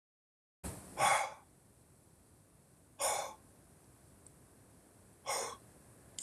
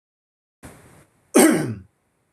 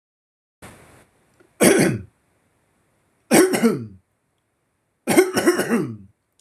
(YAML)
exhalation_length: 6.2 s
exhalation_amplitude: 3831
exhalation_signal_mean_std_ratio: 0.36
cough_length: 2.3 s
cough_amplitude: 25542
cough_signal_mean_std_ratio: 0.31
three_cough_length: 6.4 s
three_cough_amplitude: 26913
three_cough_signal_mean_std_ratio: 0.4
survey_phase: beta (2021-08-13 to 2022-03-07)
age: 18-44
gender: Male
wearing_mask: 'No'
symptom_none: true
smoker_status: Never smoked
respiratory_condition_asthma: false
respiratory_condition_other: false
recruitment_source: REACT
submission_delay: 1 day
covid_test_result: Negative
covid_test_method: RT-qPCR